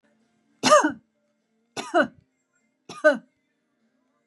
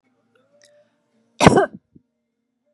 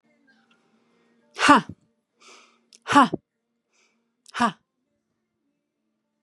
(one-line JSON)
{"three_cough_length": "4.3 s", "three_cough_amplitude": 22178, "three_cough_signal_mean_std_ratio": 0.28, "cough_length": "2.7 s", "cough_amplitude": 32768, "cough_signal_mean_std_ratio": 0.22, "exhalation_length": "6.2 s", "exhalation_amplitude": 32186, "exhalation_signal_mean_std_ratio": 0.22, "survey_phase": "beta (2021-08-13 to 2022-03-07)", "age": "45-64", "gender": "Female", "wearing_mask": "No", "symptom_none": true, "smoker_status": "Never smoked", "respiratory_condition_asthma": false, "respiratory_condition_other": false, "recruitment_source": "REACT", "submission_delay": "2 days", "covid_test_result": "Negative", "covid_test_method": "RT-qPCR", "influenza_a_test_result": "Negative", "influenza_b_test_result": "Negative"}